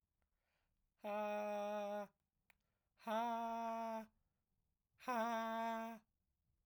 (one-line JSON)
{"exhalation_length": "6.7 s", "exhalation_amplitude": 1141, "exhalation_signal_mean_std_ratio": 0.59, "survey_phase": "alpha (2021-03-01 to 2021-08-12)", "age": "45-64", "gender": "Male", "wearing_mask": "No", "symptom_none": true, "symptom_onset": "6 days", "smoker_status": "Never smoked", "respiratory_condition_asthma": true, "respiratory_condition_other": false, "recruitment_source": "REACT", "submission_delay": "3 days", "covid_test_result": "Negative", "covid_test_method": "RT-qPCR"}